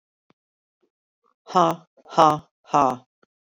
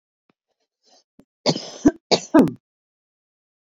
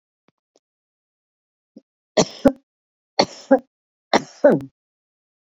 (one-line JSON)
{"exhalation_length": "3.6 s", "exhalation_amplitude": 26247, "exhalation_signal_mean_std_ratio": 0.29, "cough_length": "3.7 s", "cough_amplitude": 25423, "cough_signal_mean_std_ratio": 0.26, "three_cough_length": "5.5 s", "three_cough_amplitude": 29757, "three_cough_signal_mean_std_ratio": 0.23, "survey_phase": "beta (2021-08-13 to 2022-03-07)", "age": "45-64", "gender": "Female", "wearing_mask": "No", "symptom_none": true, "smoker_status": "Current smoker (e-cigarettes or vapes only)", "respiratory_condition_asthma": false, "respiratory_condition_other": false, "recruitment_source": "REACT", "submission_delay": "2 days", "covid_test_result": "Negative", "covid_test_method": "RT-qPCR"}